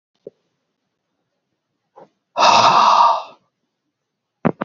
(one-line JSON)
{"exhalation_length": "4.6 s", "exhalation_amplitude": 29530, "exhalation_signal_mean_std_ratio": 0.37, "survey_phase": "beta (2021-08-13 to 2022-03-07)", "age": "65+", "gender": "Male", "wearing_mask": "No", "symptom_none": true, "smoker_status": "Never smoked", "respiratory_condition_asthma": true, "respiratory_condition_other": false, "recruitment_source": "REACT", "submission_delay": "2 days", "covid_test_result": "Negative", "covid_test_method": "RT-qPCR"}